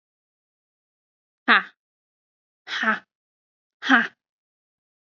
{"exhalation_length": "5.0 s", "exhalation_amplitude": 29004, "exhalation_signal_mean_std_ratio": 0.24, "survey_phase": "beta (2021-08-13 to 2022-03-07)", "age": "18-44", "gender": "Female", "wearing_mask": "No", "symptom_sore_throat": true, "symptom_fatigue": true, "symptom_headache": true, "symptom_onset": "5 days", "smoker_status": "Never smoked", "respiratory_condition_asthma": false, "respiratory_condition_other": false, "recruitment_source": "REACT", "submission_delay": "2 days", "covid_test_result": "Negative", "covid_test_method": "RT-qPCR", "influenza_a_test_result": "Negative", "influenza_b_test_result": "Negative"}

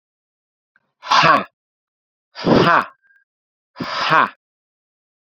{"exhalation_length": "5.3 s", "exhalation_amplitude": 32746, "exhalation_signal_mean_std_ratio": 0.36, "survey_phase": "beta (2021-08-13 to 2022-03-07)", "age": "18-44", "gender": "Male", "wearing_mask": "No", "symptom_fatigue": true, "smoker_status": "Never smoked", "respiratory_condition_asthma": false, "respiratory_condition_other": false, "recruitment_source": "Test and Trace", "submission_delay": "12 days", "covid_test_result": "Negative", "covid_test_method": "RT-qPCR"}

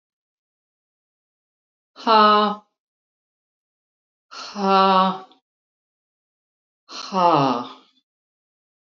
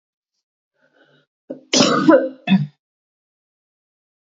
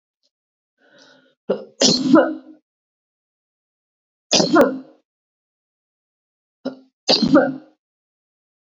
{"exhalation_length": "8.9 s", "exhalation_amplitude": 26256, "exhalation_signal_mean_std_ratio": 0.33, "cough_length": "4.3 s", "cough_amplitude": 28659, "cough_signal_mean_std_ratio": 0.32, "three_cough_length": "8.6 s", "three_cough_amplitude": 30821, "three_cough_signal_mean_std_ratio": 0.32, "survey_phase": "beta (2021-08-13 to 2022-03-07)", "age": "45-64", "gender": "Female", "wearing_mask": "No", "symptom_cough_any": true, "symptom_sore_throat": true, "smoker_status": "Never smoked", "respiratory_condition_asthma": false, "respiratory_condition_other": false, "recruitment_source": "Test and Trace", "submission_delay": "1 day", "covid_test_result": "Positive", "covid_test_method": "LFT"}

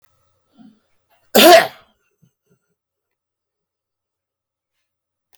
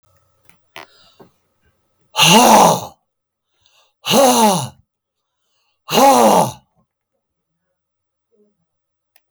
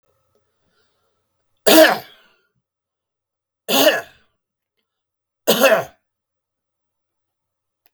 {"cough_length": "5.4 s", "cough_amplitude": 32768, "cough_signal_mean_std_ratio": 0.2, "exhalation_length": "9.3 s", "exhalation_amplitude": 32768, "exhalation_signal_mean_std_ratio": 0.37, "three_cough_length": "7.9 s", "three_cough_amplitude": 32768, "three_cough_signal_mean_std_ratio": 0.27, "survey_phase": "beta (2021-08-13 to 2022-03-07)", "age": "65+", "gender": "Male", "wearing_mask": "No", "symptom_none": true, "smoker_status": "Ex-smoker", "respiratory_condition_asthma": false, "respiratory_condition_other": false, "recruitment_source": "REACT", "submission_delay": "2 days", "covid_test_result": "Negative", "covid_test_method": "RT-qPCR"}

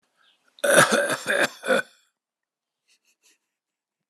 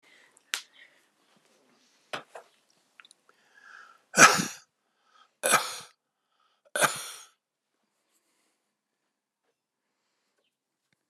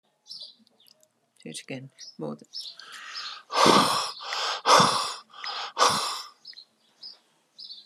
{"cough_length": "4.1 s", "cough_amplitude": 25888, "cough_signal_mean_std_ratio": 0.36, "three_cough_length": "11.1 s", "three_cough_amplitude": 29222, "three_cough_signal_mean_std_ratio": 0.19, "exhalation_length": "7.9 s", "exhalation_amplitude": 21593, "exhalation_signal_mean_std_ratio": 0.43, "survey_phase": "alpha (2021-03-01 to 2021-08-12)", "age": "65+", "gender": "Male", "wearing_mask": "No", "symptom_none": true, "smoker_status": "Never smoked", "respiratory_condition_asthma": false, "respiratory_condition_other": false, "recruitment_source": "REACT", "submission_delay": "2 days", "covid_test_result": "Negative", "covid_test_method": "RT-qPCR"}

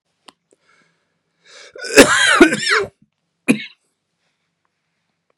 {"cough_length": "5.4 s", "cough_amplitude": 32768, "cough_signal_mean_std_ratio": 0.31, "survey_phase": "beta (2021-08-13 to 2022-03-07)", "age": "45-64", "gender": "Male", "wearing_mask": "No", "symptom_cough_any": true, "symptom_sore_throat": true, "symptom_fatigue": true, "symptom_headache": true, "symptom_onset": "2 days", "smoker_status": "Never smoked", "respiratory_condition_asthma": false, "respiratory_condition_other": false, "recruitment_source": "Test and Trace", "submission_delay": "1 day", "covid_test_result": "Positive", "covid_test_method": "ePCR"}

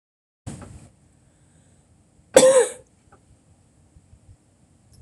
{"cough_length": "5.0 s", "cough_amplitude": 26028, "cough_signal_mean_std_ratio": 0.23, "survey_phase": "alpha (2021-03-01 to 2021-08-12)", "age": "45-64", "gender": "Female", "wearing_mask": "No", "symptom_cough_any": true, "symptom_headache": true, "smoker_status": "Never smoked", "respiratory_condition_asthma": true, "respiratory_condition_other": false, "recruitment_source": "REACT", "submission_delay": "1 day", "covid_test_result": "Negative", "covid_test_method": "RT-qPCR"}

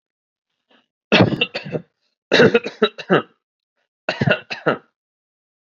{"cough_length": "5.7 s", "cough_amplitude": 30856, "cough_signal_mean_std_ratio": 0.35, "survey_phase": "beta (2021-08-13 to 2022-03-07)", "age": "18-44", "gender": "Male", "wearing_mask": "No", "symptom_cough_any": true, "symptom_new_continuous_cough": true, "symptom_runny_or_blocked_nose": true, "symptom_sore_throat": true, "symptom_onset": "11 days", "smoker_status": "Ex-smoker", "respiratory_condition_asthma": false, "respiratory_condition_other": false, "recruitment_source": "REACT", "submission_delay": "1 day", "covid_test_result": "Negative", "covid_test_method": "RT-qPCR"}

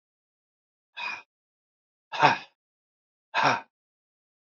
{"exhalation_length": "4.5 s", "exhalation_amplitude": 23136, "exhalation_signal_mean_std_ratio": 0.26, "survey_phase": "beta (2021-08-13 to 2022-03-07)", "age": "65+", "gender": "Male", "wearing_mask": "No", "symptom_none": true, "smoker_status": "Ex-smoker", "respiratory_condition_asthma": false, "respiratory_condition_other": false, "recruitment_source": "REACT", "submission_delay": "2 days", "covid_test_result": "Negative", "covid_test_method": "RT-qPCR", "influenza_a_test_result": "Negative", "influenza_b_test_result": "Negative"}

